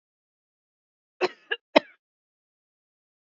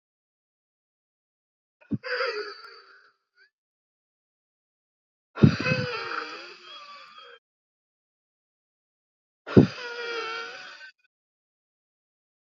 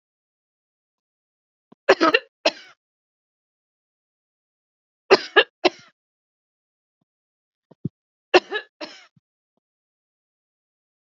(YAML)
cough_length: 3.2 s
cough_amplitude: 26693
cough_signal_mean_std_ratio: 0.13
exhalation_length: 12.5 s
exhalation_amplitude: 27370
exhalation_signal_mean_std_ratio: 0.24
three_cough_length: 11.1 s
three_cough_amplitude: 28729
three_cough_signal_mean_std_ratio: 0.17
survey_phase: beta (2021-08-13 to 2022-03-07)
age: 45-64
gender: Female
wearing_mask: 'No'
symptom_none: true
symptom_onset: 5 days
smoker_status: Ex-smoker
respiratory_condition_asthma: false
respiratory_condition_other: true
recruitment_source: REACT
submission_delay: 2 days
covid_test_result: Negative
covid_test_method: RT-qPCR
influenza_a_test_result: Negative
influenza_b_test_result: Negative